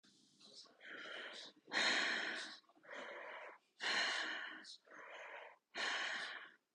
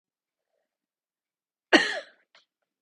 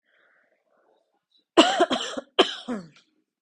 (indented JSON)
{
  "exhalation_length": "6.7 s",
  "exhalation_amplitude": 2171,
  "exhalation_signal_mean_std_ratio": 0.62,
  "cough_length": "2.8 s",
  "cough_amplitude": 22284,
  "cough_signal_mean_std_ratio": 0.19,
  "three_cough_length": "3.4 s",
  "three_cough_amplitude": 32333,
  "three_cough_signal_mean_std_ratio": 0.31,
  "survey_phase": "beta (2021-08-13 to 2022-03-07)",
  "age": "18-44",
  "gender": "Female",
  "wearing_mask": "No",
  "symptom_none": true,
  "smoker_status": "Never smoked",
  "respiratory_condition_asthma": false,
  "respiratory_condition_other": false,
  "recruitment_source": "REACT",
  "submission_delay": "4 days",
  "covid_test_result": "Negative",
  "covid_test_method": "RT-qPCR",
  "influenza_a_test_result": "Negative",
  "influenza_b_test_result": "Negative"
}